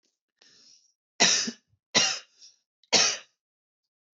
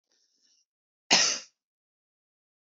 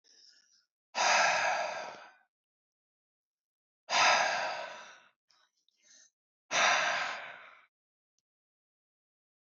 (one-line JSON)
{"three_cough_length": "4.2 s", "three_cough_amplitude": 16167, "three_cough_signal_mean_std_ratio": 0.33, "cough_length": "2.7 s", "cough_amplitude": 17708, "cough_signal_mean_std_ratio": 0.24, "exhalation_length": "9.5 s", "exhalation_amplitude": 7447, "exhalation_signal_mean_std_ratio": 0.41, "survey_phase": "beta (2021-08-13 to 2022-03-07)", "age": "18-44", "gender": "Male", "wearing_mask": "No", "symptom_runny_or_blocked_nose": true, "smoker_status": "Never smoked", "respiratory_condition_asthma": false, "respiratory_condition_other": false, "recruitment_source": "Test and Trace", "submission_delay": "2 days", "covid_test_result": "Positive", "covid_test_method": "RT-qPCR", "covid_ct_value": 29.8, "covid_ct_gene": "ORF1ab gene"}